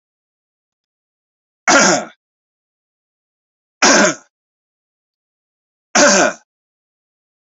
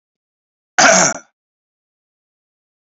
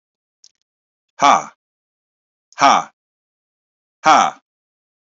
{"three_cough_length": "7.4 s", "three_cough_amplitude": 32104, "three_cough_signal_mean_std_ratio": 0.31, "cough_length": "2.9 s", "cough_amplitude": 32768, "cough_signal_mean_std_ratio": 0.28, "exhalation_length": "5.1 s", "exhalation_amplitude": 29800, "exhalation_signal_mean_std_ratio": 0.27, "survey_phase": "beta (2021-08-13 to 2022-03-07)", "age": "45-64", "gender": "Male", "wearing_mask": "No", "symptom_none": true, "smoker_status": "Never smoked", "respiratory_condition_asthma": false, "respiratory_condition_other": false, "recruitment_source": "Test and Trace", "submission_delay": "0 days", "covid_test_result": "Negative", "covid_test_method": "LFT"}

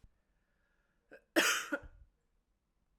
{"cough_length": "3.0 s", "cough_amplitude": 6496, "cough_signal_mean_std_ratio": 0.28, "survey_phase": "beta (2021-08-13 to 2022-03-07)", "age": "45-64", "gender": "Female", "wearing_mask": "No", "symptom_cough_any": true, "symptom_runny_or_blocked_nose": true, "symptom_shortness_of_breath": true, "symptom_fatigue": true, "symptom_headache": true, "symptom_loss_of_taste": true, "smoker_status": "Never smoked", "respiratory_condition_asthma": false, "respiratory_condition_other": false, "recruitment_source": "Test and Trace", "submission_delay": "2 days", "covid_test_result": "Positive", "covid_test_method": "LFT"}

